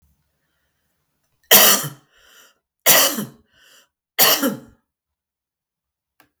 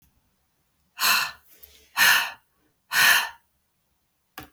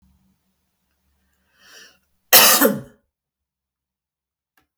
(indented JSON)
{
  "three_cough_length": "6.4 s",
  "three_cough_amplitude": 32768,
  "three_cough_signal_mean_std_ratio": 0.31,
  "exhalation_length": "4.5 s",
  "exhalation_amplitude": 20246,
  "exhalation_signal_mean_std_ratio": 0.37,
  "cough_length": "4.8 s",
  "cough_amplitude": 32768,
  "cough_signal_mean_std_ratio": 0.24,
  "survey_phase": "beta (2021-08-13 to 2022-03-07)",
  "age": "65+",
  "gender": "Female",
  "wearing_mask": "No",
  "symptom_none": true,
  "smoker_status": "Never smoked",
  "respiratory_condition_asthma": false,
  "respiratory_condition_other": false,
  "recruitment_source": "REACT",
  "submission_delay": "2 days",
  "covid_test_result": "Negative",
  "covid_test_method": "RT-qPCR",
  "influenza_a_test_result": "Negative",
  "influenza_b_test_result": "Negative"
}